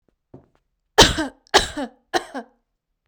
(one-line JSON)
{"three_cough_length": "3.1 s", "three_cough_amplitude": 32768, "three_cough_signal_mean_std_ratio": 0.28, "survey_phase": "beta (2021-08-13 to 2022-03-07)", "age": "18-44", "gender": "Female", "wearing_mask": "No", "symptom_none": true, "symptom_onset": "12 days", "smoker_status": "Ex-smoker", "respiratory_condition_asthma": false, "respiratory_condition_other": false, "recruitment_source": "REACT", "submission_delay": "0 days", "covid_test_result": "Negative", "covid_test_method": "RT-qPCR"}